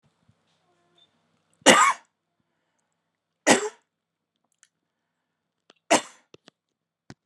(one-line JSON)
{"three_cough_length": "7.3 s", "three_cough_amplitude": 31737, "three_cough_signal_mean_std_ratio": 0.21, "survey_phase": "beta (2021-08-13 to 2022-03-07)", "age": "18-44", "gender": "Female", "wearing_mask": "No", "symptom_sore_throat": true, "symptom_onset": "11 days", "smoker_status": "Current smoker (1 to 10 cigarettes per day)", "respiratory_condition_asthma": false, "respiratory_condition_other": false, "recruitment_source": "REACT", "submission_delay": "4 days", "covid_test_result": "Negative", "covid_test_method": "RT-qPCR", "influenza_a_test_result": "Negative", "influenza_b_test_result": "Negative"}